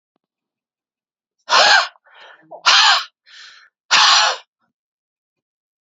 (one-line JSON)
{"exhalation_length": "5.8 s", "exhalation_amplitude": 32767, "exhalation_signal_mean_std_ratio": 0.38, "survey_phase": "beta (2021-08-13 to 2022-03-07)", "age": "45-64", "gender": "Male", "wearing_mask": "No", "symptom_cough_any": true, "symptom_runny_or_blocked_nose": true, "symptom_fatigue": true, "symptom_headache": true, "symptom_other": true, "symptom_onset": "2 days", "smoker_status": "Never smoked", "respiratory_condition_asthma": false, "respiratory_condition_other": false, "recruitment_source": "Test and Trace", "submission_delay": "0 days", "covid_test_result": "Positive", "covid_test_method": "ePCR"}